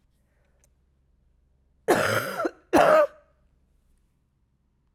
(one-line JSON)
{"cough_length": "4.9 s", "cough_amplitude": 18331, "cough_signal_mean_std_ratio": 0.33, "survey_phase": "alpha (2021-03-01 to 2021-08-12)", "age": "45-64", "gender": "Female", "wearing_mask": "No", "symptom_cough_any": true, "symptom_shortness_of_breath": true, "symptom_fatigue": true, "symptom_headache": true, "symptom_change_to_sense_of_smell_or_taste": true, "symptom_loss_of_taste": true, "smoker_status": "Prefer not to say", "respiratory_condition_asthma": false, "respiratory_condition_other": false, "recruitment_source": "Test and Trace", "submission_delay": "2 days", "covid_test_result": "Positive", "covid_test_method": "RT-qPCR"}